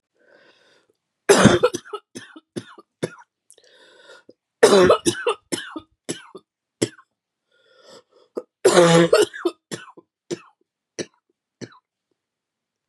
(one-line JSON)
{"three_cough_length": "12.9 s", "three_cough_amplitude": 32746, "three_cough_signal_mean_std_ratio": 0.3, "survey_phase": "beta (2021-08-13 to 2022-03-07)", "age": "45-64", "gender": "Female", "wearing_mask": "No", "symptom_cough_any": true, "symptom_new_continuous_cough": true, "symptom_runny_or_blocked_nose": true, "symptom_shortness_of_breath": true, "symptom_sore_throat": true, "symptom_fatigue": true, "symptom_headache": true, "symptom_onset": "4 days", "smoker_status": "Never smoked", "respiratory_condition_asthma": true, "respiratory_condition_other": false, "recruitment_source": "Test and Trace", "submission_delay": "2 days", "covid_test_result": "Positive", "covid_test_method": "ePCR"}